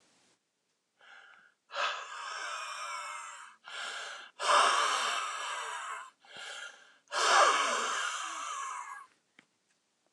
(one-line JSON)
{"exhalation_length": "10.1 s", "exhalation_amplitude": 8825, "exhalation_signal_mean_std_ratio": 0.54, "survey_phase": "beta (2021-08-13 to 2022-03-07)", "age": "65+", "gender": "Male", "wearing_mask": "No", "symptom_cough_any": true, "symptom_runny_or_blocked_nose": true, "symptom_shortness_of_breath": true, "symptom_fatigue": true, "symptom_headache": true, "symptom_change_to_sense_of_smell_or_taste": true, "symptom_loss_of_taste": true, "smoker_status": "Ex-smoker", "respiratory_condition_asthma": false, "respiratory_condition_other": false, "recruitment_source": "Test and Trace", "submission_delay": "1 day", "covid_test_result": "Positive", "covid_test_method": "LFT"}